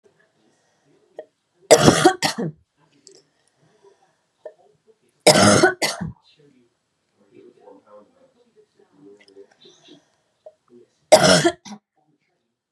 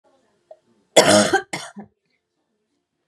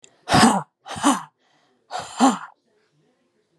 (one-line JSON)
{"three_cough_length": "12.7 s", "three_cough_amplitude": 32768, "three_cough_signal_mean_std_ratio": 0.27, "cough_length": "3.1 s", "cough_amplitude": 32768, "cough_signal_mean_std_ratio": 0.3, "exhalation_length": "3.6 s", "exhalation_amplitude": 31294, "exhalation_signal_mean_std_ratio": 0.37, "survey_phase": "beta (2021-08-13 to 2022-03-07)", "age": "18-44", "gender": "Female", "wearing_mask": "No", "symptom_cough_any": true, "symptom_sore_throat": true, "symptom_fatigue": true, "symptom_headache": true, "symptom_onset": "6 days", "smoker_status": "Never smoked", "respiratory_condition_asthma": false, "respiratory_condition_other": false, "recruitment_source": "Test and Trace", "submission_delay": "4 days", "covid_test_result": "Positive", "covid_test_method": "RT-qPCR", "covid_ct_value": 28.0, "covid_ct_gene": "N gene"}